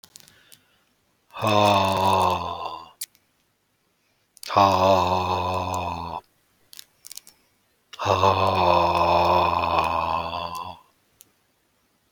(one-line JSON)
{"exhalation_length": "12.1 s", "exhalation_amplitude": 21633, "exhalation_signal_mean_std_ratio": 0.55, "survey_phase": "beta (2021-08-13 to 2022-03-07)", "age": "45-64", "gender": "Male", "wearing_mask": "No", "symptom_none": true, "smoker_status": "Ex-smoker", "respiratory_condition_asthma": false, "respiratory_condition_other": false, "recruitment_source": "REACT", "submission_delay": "1 day", "covid_test_result": "Negative", "covid_test_method": "RT-qPCR"}